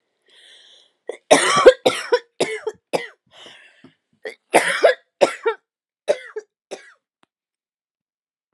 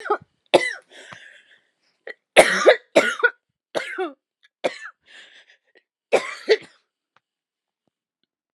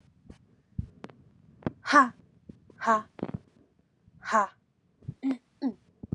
{
  "cough_length": "8.5 s",
  "cough_amplitude": 32768,
  "cough_signal_mean_std_ratio": 0.3,
  "three_cough_length": "8.5 s",
  "three_cough_amplitude": 32768,
  "three_cough_signal_mean_std_ratio": 0.28,
  "exhalation_length": "6.1 s",
  "exhalation_amplitude": 19633,
  "exhalation_signal_mean_std_ratio": 0.3,
  "survey_phase": "alpha (2021-03-01 to 2021-08-12)",
  "age": "18-44",
  "gender": "Female",
  "wearing_mask": "No",
  "symptom_cough_any": true,
  "symptom_shortness_of_breath": true,
  "symptom_fatigue": true,
  "symptom_change_to_sense_of_smell_or_taste": true,
  "symptom_loss_of_taste": true,
  "symptom_onset": "4 days",
  "smoker_status": "Never smoked",
  "respiratory_condition_asthma": false,
  "respiratory_condition_other": false,
  "recruitment_source": "Test and Trace",
  "submission_delay": "2 days",
  "covid_test_result": "Positive",
  "covid_test_method": "RT-qPCR",
  "covid_ct_value": 20.2,
  "covid_ct_gene": "N gene",
  "covid_ct_mean": 20.4,
  "covid_viral_load": "200000 copies/ml",
  "covid_viral_load_category": "Low viral load (10K-1M copies/ml)"
}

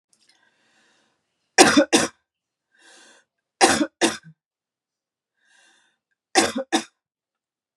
{
  "cough_length": "7.8 s",
  "cough_amplitude": 32721,
  "cough_signal_mean_std_ratio": 0.27,
  "survey_phase": "beta (2021-08-13 to 2022-03-07)",
  "age": "45-64",
  "gender": "Female",
  "wearing_mask": "No",
  "symptom_cough_any": true,
  "symptom_runny_or_blocked_nose": true,
  "symptom_sore_throat": true,
  "symptom_headache": true,
  "symptom_onset": "3 days",
  "smoker_status": "Never smoked",
  "respiratory_condition_asthma": false,
  "respiratory_condition_other": false,
  "recruitment_source": "Test and Trace",
  "submission_delay": "1 day",
  "covid_test_result": "Negative",
  "covid_test_method": "RT-qPCR"
}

